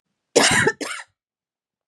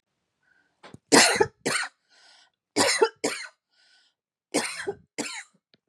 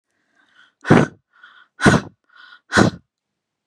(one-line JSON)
{"cough_length": "1.9 s", "cough_amplitude": 29573, "cough_signal_mean_std_ratio": 0.39, "three_cough_length": "5.9 s", "three_cough_amplitude": 25865, "three_cough_signal_mean_std_ratio": 0.35, "exhalation_length": "3.7 s", "exhalation_amplitude": 32768, "exhalation_signal_mean_std_ratio": 0.3, "survey_phase": "beta (2021-08-13 to 2022-03-07)", "age": "18-44", "gender": "Female", "wearing_mask": "No", "symptom_runny_or_blocked_nose": true, "symptom_onset": "7 days", "smoker_status": "Never smoked", "respiratory_condition_asthma": false, "respiratory_condition_other": false, "recruitment_source": "REACT", "submission_delay": "1 day", "covid_test_result": "Negative", "covid_test_method": "RT-qPCR", "influenza_a_test_result": "Negative", "influenza_b_test_result": "Negative"}